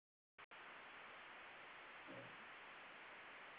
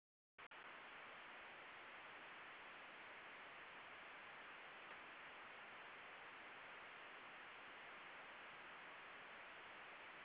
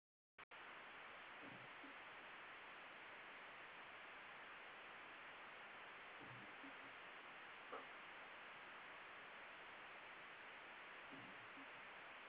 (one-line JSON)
{"cough_length": "3.6 s", "cough_amplitude": 191, "cough_signal_mean_std_ratio": 1.08, "exhalation_length": "10.2 s", "exhalation_amplitude": 161, "exhalation_signal_mean_std_ratio": 1.22, "three_cough_length": "12.3 s", "three_cough_amplitude": 277, "three_cough_signal_mean_std_ratio": 1.21, "survey_phase": "beta (2021-08-13 to 2022-03-07)", "age": "18-44", "gender": "Female", "wearing_mask": "No", "symptom_cough_any": true, "symptom_runny_or_blocked_nose": true, "symptom_sore_throat": true, "symptom_fatigue": true, "symptom_change_to_sense_of_smell_or_taste": true, "symptom_onset": "4 days", "smoker_status": "Never smoked", "respiratory_condition_asthma": false, "respiratory_condition_other": false, "recruitment_source": "Test and Trace", "submission_delay": "0 days", "covid_test_result": "Positive", "covid_test_method": "RT-qPCR", "covid_ct_value": 12.1, "covid_ct_gene": "ORF1ab gene", "covid_ct_mean": 12.3, "covid_viral_load": "89000000 copies/ml", "covid_viral_load_category": "High viral load (>1M copies/ml)"}